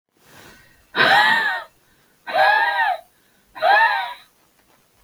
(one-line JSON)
{"exhalation_length": "5.0 s", "exhalation_amplitude": 27123, "exhalation_signal_mean_std_ratio": 0.52, "survey_phase": "beta (2021-08-13 to 2022-03-07)", "age": "65+", "gender": "Female", "wearing_mask": "No", "symptom_cough_any": true, "symptom_runny_or_blocked_nose": true, "symptom_sore_throat": true, "symptom_change_to_sense_of_smell_or_taste": true, "symptom_other": true, "smoker_status": "Ex-smoker", "respiratory_condition_asthma": false, "respiratory_condition_other": false, "recruitment_source": "Test and Trace", "submission_delay": "0 days", "covid_test_result": "Positive", "covid_test_method": "LFT"}